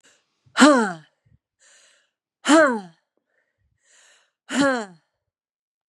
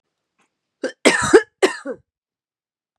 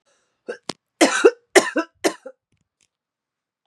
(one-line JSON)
{"exhalation_length": "5.9 s", "exhalation_amplitude": 26842, "exhalation_signal_mean_std_ratio": 0.3, "cough_length": "3.0 s", "cough_amplitude": 32768, "cough_signal_mean_std_ratio": 0.29, "three_cough_length": "3.7 s", "three_cough_amplitude": 32660, "three_cough_signal_mean_std_ratio": 0.27, "survey_phase": "beta (2021-08-13 to 2022-03-07)", "age": "18-44", "gender": "Female", "wearing_mask": "No", "symptom_cough_any": true, "symptom_runny_or_blocked_nose": true, "symptom_sore_throat": true, "symptom_fatigue": true, "smoker_status": "Ex-smoker", "respiratory_condition_asthma": false, "respiratory_condition_other": false, "recruitment_source": "Test and Trace", "submission_delay": "1 day", "covid_test_result": "Positive", "covid_test_method": "ePCR"}